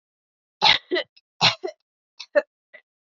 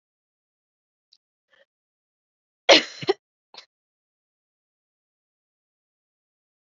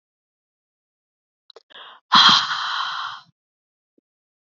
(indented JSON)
{
  "three_cough_length": "3.1 s",
  "three_cough_amplitude": 24962,
  "three_cough_signal_mean_std_ratio": 0.3,
  "cough_length": "6.7 s",
  "cough_amplitude": 32768,
  "cough_signal_mean_std_ratio": 0.13,
  "exhalation_length": "4.5 s",
  "exhalation_amplitude": 28866,
  "exhalation_signal_mean_std_ratio": 0.3,
  "survey_phase": "beta (2021-08-13 to 2022-03-07)",
  "age": "18-44",
  "gender": "Female",
  "wearing_mask": "No",
  "symptom_cough_any": true,
  "symptom_runny_or_blocked_nose": true,
  "symptom_shortness_of_breath": true,
  "symptom_sore_throat": true,
  "symptom_fatigue": true,
  "symptom_onset": "8 days",
  "smoker_status": "Never smoked",
  "respiratory_condition_asthma": false,
  "respiratory_condition_other": false,
  "recruitment_source": "Test and Trace",
  "submission_delay": "2 days",
  "covid_test_result": "Positive",
  "covid_test_method": "RT-qPCR",
  "covid_ct_value": 12.9,
  "covid_ct_gene": "ORF1ab gene"
}